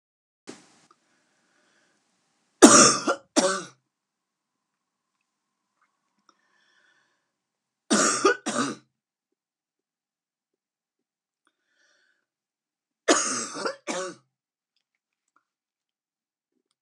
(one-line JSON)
{"three_cough_length": "16.8 s", "three_cough_amplitude": 32767, "three_cough_signal_mean_std_ratio": 0.22, "survey_phase": "beta (2021-08-13 to 2022-03-07)", "age": "45-64", "gender": "Female", "wearing_mask": "No", "symptom_cough_any": true, "symptom_new_continuous_cough": true, "symptom_runny_or_blocked_nose": true, "symptom_fatigue": true, "symptom_headache": true, "symptom_onset": "9 days", "smoker_status": "Never smoked", "respiratory_condition_asthma": false, "respiratory_condition_other": false, "recruitment_source": "Test and Trace", "submission_delay": "2 days", "covid_test_result": "Positive", "covid_test_method": "RT-qPCR", "covid_ct_value": 17.7, "covid_ct_gene": "ORF1ab gene", "covid_ct_mean": 18.2, "covid_viral_load": "1100000 copies/ml", "covid_viral_load_category": "High viral load (>1M copies/ml)"}